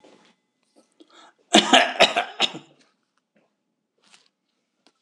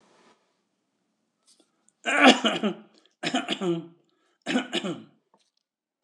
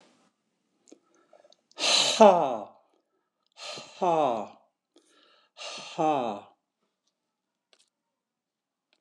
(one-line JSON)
{"cough_length": "5.0 s", "cough_amplitude": 26028, "cough_signal_mean_std_ratio": 0.26, "three_cough_length": "6.0 s", "three_cough_amplitude": 24867, "three_cough_signal_mean_std_ratio": 0.33, "exhalation_length": "9.0 s", "exhalation_amplitude": 23245, "exhalation_signal_mean_std_ratio": 0.3, "survey_phase": "beta (2021-08-13 to 2022-03-07)", "age": "65+", "gender": "Male", "wearing_mask": "No", "symptom_none": true, "smoker_status": "Ex-smoker", "respiratory_condition_asthma": false, "respiratory_condition_other": false, "recruitment_source": "REACT", "submission_delay": "3 days", "covid_test_result": "Negative", "covid_test_method": "RT-qPCR", "influenza_a_test_result": "Negative", "influenza_b_test_result": "Negative"}